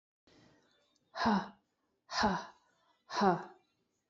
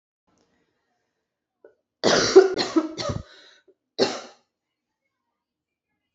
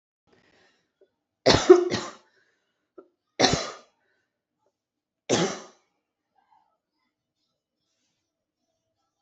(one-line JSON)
{"exhalation_length": "4.1 s", "exhalation_amplitude": 6339, "exhalation_signal_mean_std_ratio": 0.37, "cough_length": "6.1 s", "cough_amplitude": 28522, "cough_signal_mean_std_ratio": 0.28, "three_cough_length": "9.2 s", "three_cough_amplitude": 26247, "three_cough_signal_mean_std_ratio": 0.22, "survey_phase": "beta (2021-08-13 to 2022-03-07)", "age": "18-44", "gender": "Female", "wearing_mask": "No", "symptom_runny_or_blocked_nose": true, "symptom_fatigue": true, "symptom_fever_high_temperature": true, "symptom_change_to_sense_of_smell_or_taste": true, "symptom_loss_of_taste": true, "symptom_other": true, "symptom_onset": "5 days", "smoker_status": "Never smoked", "respiratory_condition_asthma": false, "respiratory_condition_other": false, "recruitment_source": "Test and Trace", "submission_delay": "1 day", "covid_test_result": "Positive", "covid_test_method": "RT-qPCR", "covid_ct_value": 18.0, "covid_ct_gene": "ORF1ab gene", "covid_ct_mean": 18.8, "covid_viral_load": "680000 copies/ml", "covid_viral_load_category": "Low viral load (10K-1M copies/ml)"}